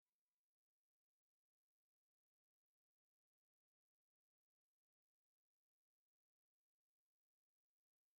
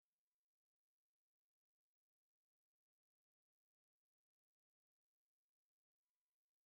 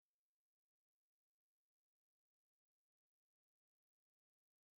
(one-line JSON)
{"three_cough_length": "8.2 s", "three_cough_amplitude": 2, "three_cough_signal_mean_std_ratio": 0.07, "exhalation_length": "6.7 s", "exhalation_amplitude": 1, "exhalation_signal_mean_std_ratio": 0.07, "cough_length": "4.8 s", "cough_amplitude": 1, "cough_signal_mean_std_ratio": 0.06, "survey_phase": "beta (2021-08-13 to 2022-03-07)", "age": "45-64", "gender": "Female", "wearing_mask": "No", "symptom_none": true, "symptom_onset": "12 days", "smoker_status": "Never smoked", "respiratory_condition_asthma": false, "respiratory_condition_other": false, "recruitment_source": "REACT", "submission_delay": "2 days", "covid_test_result": "Negative", "covid_test_method": "RT-qPCR", "influenza_a_test_result": "Negative", "influenza_b_test_result": "Negative"}